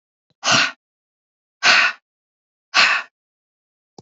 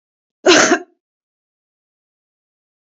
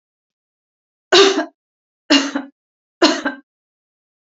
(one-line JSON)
{"exhalation_length": "4.0 s", "exhalation_amplitude": 30435, "exhalation_signal_mean_std_ratio": 0.36, "cough_length": "2.8 s", "cough_amplitude": 30709, "cough_signal_mean_std_ratio": 0.27, "three_cough_length": "4.3 s", "three_cough_amplitude": 31280, "three_cough_signal_mean_std_ratio": 0.33, "survey_phase": "beta (2021-08-13 to 2022-03-07)", "age": "45-64", "gender": "Female", "wearing_mask": "No", "symptom_none": true, "smoker_status": "Never smoked", "respiratory_condition_asthma": false, "respiratory_condition_other": false, "recruitment_source": "Test and Trace", "submission_delay": "1 day", "covid_test_result": "Negative", "covid_test_method": "RT-qPCR"}